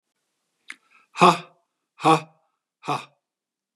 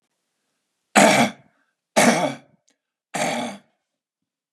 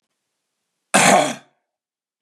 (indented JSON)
{
  "exhalation_length": "3.8 s",
  "exhalation_amplitude": 29485,
  "exhalation_signal_mean_std_ratio": 0.25,
  "three_cough_length": "4.5 s",
  "three_cough_amplitude": 29631,
  "three_cough_signal_mean_std_ratio": 0.36,
  "cough_length": "2.2 s",
  "cough_amplitude": 32767,
  "cough_signal_mean_std_ratio": 0.33,
  "survey_phase": "beta (2021-08-13 to 2022-03-07)",
  "age": "45-64",
  "gender": "Male",
  "wearing_mask": "No",
  "symptom_none": true,
  "smoker_status": "Never smoked",
  "respiratory_condition_asthma": false,
  "respiratory_condition_other": false,
  "recruitment_source": "REACT",
  "submission_delay": "2 days",
  "covid_test_result": "Negative",
  "covid_test_method": "RT-qPCR",
  "influenza_a_test_result": "Negative",
  "influenza_b_test_result": "Negative"
}